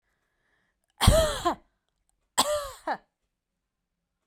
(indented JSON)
{
  "cough_length": "4.3 s",
  "cough_amplitude": 18861,
  "cough_signal_mean_std_ratio": 0.32,
  "survey_phase": "beta (2021-08-13 to 2022-03-07)",
  "age": "45-64",
  "gender": "Female",
  "wearing_mask": "No",
  "symptom_none": true,
  "smoker_status": "Ex-smoker",
  "respiratory_condition_asthma": false,
  "respiratory_condition_other": false,
  "recruitment_source": "REACT",
  "submission_delay": "1 day",
  "covid_test_result": "Negative",
  "covid_test_method": "RT-qPCR"
}